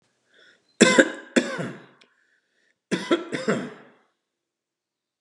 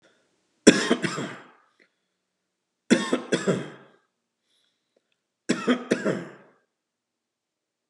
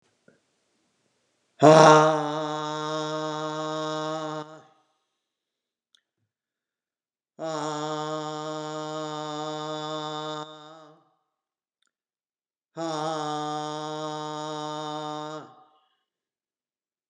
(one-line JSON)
{"cough_length": "5.2 s", "cough_amplitude": 32671, "cough_signal_mean_std_ratio": 0.31, "three_cough_length": "7.9 s", "three_cough_amplitude": 32768, "three_cough_signal_mean_std_ratio": 0.3, "exhalation_length": "17.1 s", "exhalation_amplitude": 32332, "exhalation_signal_mean_std_ratio": 0.36, "survey_phase": "beta (2021-08-13 to 2022-03-07)", "age": "65+", "gender": "Male", "wearing_mask": "No", "symptom_none": true, "smoker_status": "Never smoked", "respiratory_condition_asthma": false, "respiratory_condition_other": false, "recruitment_source": "REACT", "submission_delay": "1 day", "covid_test_result": "Negative", "covid_test_method": "RT-qPCR", "influenza_a_test_result": "Negative", "influenza_b_test_result": "Negative"}